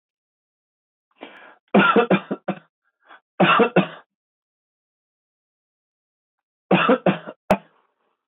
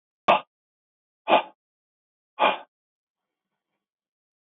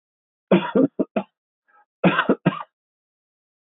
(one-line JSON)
{"three_cough_length": "8.3 s", "three_cough_amplitude": 21802, "three_cough_signal_mean_std_ratio": 0.32, "exhalation_length": "4.4 s", "exhalation_amplitude": 17557, "exhalation_signal_mean_std_ratio": 0.23, "cough_length": "3.8 s", "cough_amplitude": 20927, "cough_signal_mean_std_ratio": 0.34, "survey_phase": "beta (2021-08-13 to 2022-03-07)", "age": "45-64", "gender": "Male", "wearing_mask": "No", "symptom_diarrhoea": true, "smoker_status": "Never smoked", "respiratory_condition_asthma": false, "respiratory_condition_other": false, "recruitment_source": "REACT", "submission_delay": "1 day", "covid_test_result": "Negative", "covid_test_method": "RT-qPCR", "influenza_a_test_result": "Negative", "influenza_b_test_result": "Negative"}